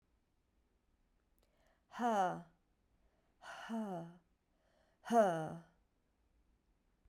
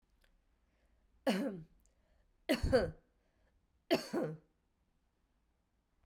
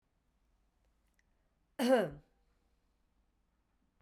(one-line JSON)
{"exhalation_length": "7.1 s", "exhalation_amplitude": 3405, "exhalation_signal_mean_std_ratio": 0.33, "three_cough_length": "6.1 s", "three_cough_amplitude": 4649, "three_cough_signal_mean_std_ratio": 0.32, "cough_length": "4.0 s", "cough_amplitude": 4384, "cough_signal_mean_std_ratio": 0.23, "survey_phase": "beta (2021-08-13 to 2022-03-07)", "age": "45-64", "gender": "Female", "wearing_mask": "No", "symptom_cough_any": true, "symptom_runny_or_blocked_nose": true, "symptom_sore_throat": true, "symptom_fatigue": true, "symptom_headache": true, "smoker_status": "Never smoked", "respiratory_condition_asthma": false, "respiratory_condition_other": false, "recruitment_source": "Test and Trace", "submission_delay": "3 days", "covid_test_result": "Positive", "covid_test_method": "ePCR"}